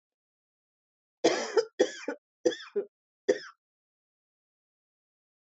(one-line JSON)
{"cough_length": "5.5 s", "cough_amplitude": 9672, "cough_signal_mean_std_ratio": 0.27, "survey_phase": "beta (2021-08-13 to 2022-03-07)", "age": "45-64", "gender": "Female", "wearing_mask": "No", "symptom_none": true, "smoker_status": "Never smoked", "respiratory_condition_asthma": false, "respiratory_condition_other": false, "recruitment_source": "REACT", "submission_delay": "2 days", "covid_test_result": "Negative", "covid_test_method": "RT-qPCR"}